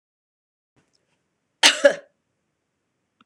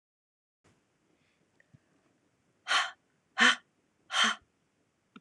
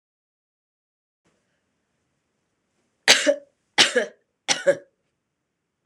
cough_length: 3.3 s
cough_amplitude: 26028
cough_signal_mean_std_ratio: 0.19
exhalation_length: 5.2 s
exhalation_amplitude: 11329
exhalation_signal_mean_std_ratio: 0.26
three_cough_length: 5.9 s
three_cough_amplitude: 26028
three_cough_signal_mean_std_ratio: 0.24
survey_phase: beta (2021-08-13 to 2022-03-07)
age: 45-64
gender: Female
wearing_mask: 'No'
symptom_none: true
smoker_status: Never smoked
respiratory_condition_asthma: true
respiratory_condition_other: false
recruitment_source: REACT
submission_delay: 1 day
covid_test_result: Negative
covid_test_method: RT-qPCR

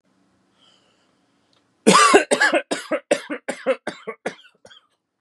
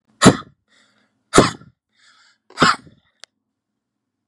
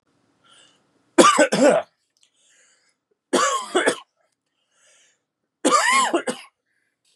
cough_length: 5.2 s
cough_amplitude: 32767
cough_signal_mean_std_ratio: 0.36
exhalation_length: 4.3 s
exhalation_amplitude: 32768
exhalation_signal_mean_std_ratio: 0.24
three_cough_length: 7.2 s
three_cough_amplitude: 32767
three_cough_signal_mean_std_ratio: 0.39
survey_phase: beta (2021-08-13 to 2022-03-07)
age: 18-44
gender: Male
wearing_mask: 'No'
symptom_none: true
smoker_status: Never smoked
respiratory_condition_asthma: true
respiratory_condition_other: false
recruitment_source: REACT
submission_delay: 2 days
covid_test_result: Negative
covid_test_method: RT-qPCR
influenza_a_test_result: Negative
influenza_b_test_result: Negative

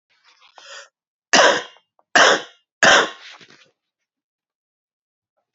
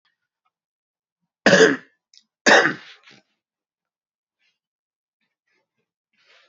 three_cough_length: 5.5 s
three_cough_amplitude: 30813
three_cough_signal_mean_std_ratio: 0.3
cough_length: 6.5 s
cough_amplitude: 28510
cough_signal_mean_std_ratio: 0.23
survey_phase: beta (2021-08-13 to 2022-03-07)
age: 18-44
gender: Male
wearing_mask: 'No'
symptom_cough_any: true
symptom_runny_or_blocked_nose: true
symptom_sore_throat: true
symptom_headache: true
symptom_other: true
smoker_status: Never smoked
respiratory_condition_asthma: false
respiratory_condition_other: false
recruitment_source: Test and Trace
submission_delay: 1 day
covid_test_result: Positive
covid_test_method: RT-qPCR
covid_ct_value: 31.2
covid_ct_gene: ORF1ab gene
covid_ct_mean: 32.6
covid_viral_load: 20 copies/ml
covid_viral_load_category: Minimal viral load (< 10K copies/ml)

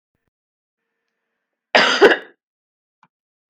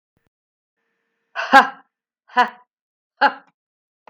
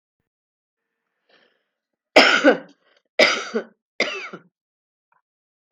cough_length: 3.5 s
cough_amplitude: 32768
cough_signal_mean_std_ratio: 0.25
exhalation_length: 4.1 s
exhalation_amplitude: 32767
exhalation_signal_mean_std_ratio: 0.23
three_cough_length: 5.7 s
three_cough_amplitude: 32768
three_cough_signal_mean_std_ratio: 0.28
survey_phase: beta (2021-08-13 to 2022-03-07)
age: 45-64
gender: Female
wearing_mask: 'No'
symptom_cough_any: true
smoker_status: Never smoked
respiratory_condition_asthma: false
respiratory_condition_other: false
recruitment_source: REACT
submission_delay: 2 days
covid_test_result: Negative
covid_test_method: RT-qPCR
influenza_a_test_result: Unknown/Void
influenza_b_test_result: Unknown/Void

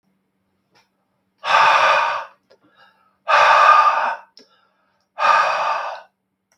exhalation_length: 6.6 s
exhalation_amplitude: 32553
exhalation_signal_mean_std_ratio: 0.5
survey_phase: beta (2021-08-13 to 2022-03-07)
age: 65+
gender: Male
wearing_mask: 'No'
symptom_none: true
smoker_status: Ex-smoker
respiratory_condition_asthma: false
respiratory_condition_other: false
recruitment_source: REACT
submission_delay: 0 days
covid_test_result: Negative
covid_test_method: RT-qPCR
influenza_a_test_result: Unknown/Void
influenza_b_test_result: Unknown/Void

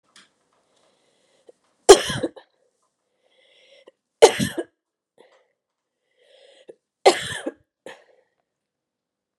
three_cough_length: 9.4 s
three_cough_amplitude: 32768
three_cough_signal_mean_std_ratio: 0.17
survey_phase: beta (2021-08-13 to 2022-03-07)
age: 18-44
gender: Female
wearing_mask: 'No'
symptom_cough_any: true
symptom_runny_or_blocked_nose: true
symptom_abdominal_pain: true
symptom_diarrhoea: true
symptom_headache: true
symptom_change_to_sense_of_smell_or_taste: true
symptom_onset: 3 days
smoker_status: Ex-smoker
respiratory_condition_asthma: true
respiratory_condition_other: false
recruitment_source: Test and Trace
submission_delay: 2 days
covid_test_result: Positive
covid_test_method: RT-qPCR
covid_ct_value: 21.3
covid_ct_gene: ORF1ab gene
covid_ct_mean: 21.5
covid_viral_load: 88000 copies/ml
covid_viral_load_category: Low viral load (10K-1M copies/ml)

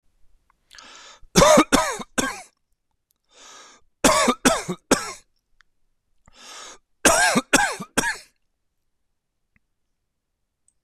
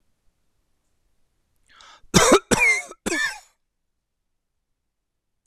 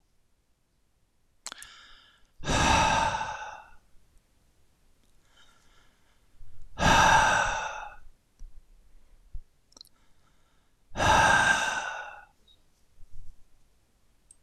three_cough_length: 10.8 s
three_cough_amplitude: 26027
three_cough_signal_mean_std_ratio: 0.34
cough_length: 5.5 s
cough_amplitude: 26028
cough_signal_mean_std_ratio: 0.3
exhalation_length: 14.4 s
exhalation_amplitude: 13872
exhalation_signal_mean_std_ratio: 0.41
survey_phase: beta (2021-08-13 to 2022-03-07)
age: 45-64
gender: Male
wearing_mask: 'No'
symptom_none: true
smoker_status: Never smoked
respiratory_condition_asthma: false
respiratory_condition_other: false
recruitment_source: Test and Trace
submission_delay: 1 day
covid_test_result: Negative
covid_test_method: RT-qPCR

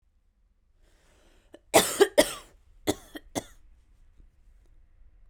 cough_length: 5.3 s
cough_amplitude: 20921
cough_signal_mean_std_ratio: 0.24
survey_phase: beta (2021-08-13 to 2022-03-07)
age: 18-44
gender: Female
wearing_mask: 'No'
symptom_none: true
smoker_status: Never smoked
respiratory_condition_asthma: false
respiratory_condition_other: false
recruitment_source: REACT
submission_delay: 2 days
covid_test_result: Negative
covid_test_method: RT-qPCR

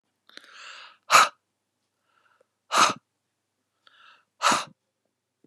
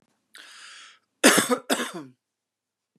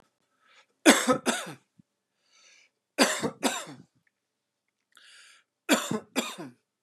exhalation_length: 5.5 s
exhalation_amplitude: 25018
exhalation_signal_mean_std_ratio: 0.25
cough_length: 3.0 s
cough_amplitude: 27444
cough_signal_mean_std_ratio: 0.31
three_cough_length: 6.8 s
three_cough_amplitude: 25724
three_cough_signal_mean_std_ratio: 0.31
survey_phase: beta (2021-08-13 to 2022-03-07)
age: 45-64
gender: Female
wearing_mask: 'No'
symptom_change_to_sense_of_smell_or_taste: true
symptom_loss_of_taste: true
symptom_onset: 12 days
smoker_status: Ex-smoker
respiratory_condition_asthma: false
respiratory_condition_other: false
recruitment_source: REACT
submission_delay: 1 day
covid_test_result: Negative
covid_test_method: RT-qPCR
influenza_a_test_result: Negative
influenza_b_test_result: Negative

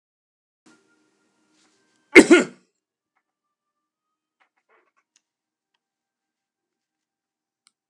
cough_length: 7.9 s
cough_amplitude: 32768
cough_signal_mean_std_ratio: 0.13
survey_phase: beta (2021-08-13 to 2022-03-07)
age: 65+
gender: Male
wearing_mask: 'No'
symptom_fatigue: true
symptom_onset: 12 days
smoker_status: Never smoked
respiratory_condition_asthma: false
respiratory_condition_other: false
recruitment_source: REACT
submission_delay: 6 days
covid_test_result: Negative
covid_test_method: RT-qPCR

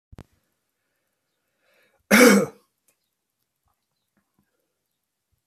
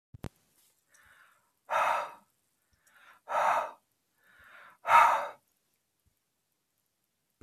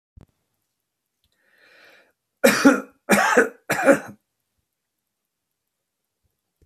cough_length: 5.5 s
cough_amplitude: 26905
cough_signal_mean_std_ratio: 0.2
exhalation_length: 7.4 s
exhalation_amplitude: 12949
exhalation_signal_mean_std_ratio: 0.3
three_cough_length: 6.7 s
three_cough_amplitude: 27662
three_cough_signal_mean_std_ratio: 0.29
survey_phase: beta (2021-08-13 to 2022-03-07)
age: 45-64
gender: Male
wearing_mask: 'No'
symptom_diarrhoea: true
smoker_status: Never smoked
respiratory_condition_asthma: false
respiratory_condition_other: false
recruitment_source: Test and Trace
submission_delay: 2 days
covid_test_result: Positive
covid_test_method: RT-qPCR
covid_ct_value: 26.4
covid_ct_gene: ORF1ab gene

